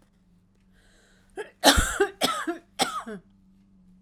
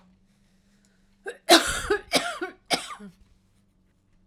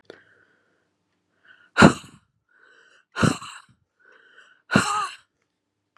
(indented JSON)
{
  "three_cough_length": "4.0 s",
  "three_cough_amplitude": 32767,
  "three_cough_signal_mean_std_ratio": 0.36,
  "cough_length": "4.3 s",
  "cough_amplitude": 30526,
  "cough_signal_mean_std_ratio": 0.31,
  "exhalation_length": "6.0 s",
  "exhalation_amplitude": 32768,
  "exhalation_signal_mean_std_ratio": 0.23,
  "survey_phase": "alpha (2021-03-01 to 2021-08-12)",
  "age": "65+",
  "gender": "Female",
  "wearing_mask": "No",
  "symptom_cough_any": true,
  "smoker_status": "Ex-smoker",
  "respiratory_condition_asthma": false,
  "respiratory_condition_other": false,
  "recruitment_source": "REACT",
  "submission_delay": "1 day",
  "covid_test_result": "Negative",
  "covid_test_method": "RT-qPCR"
}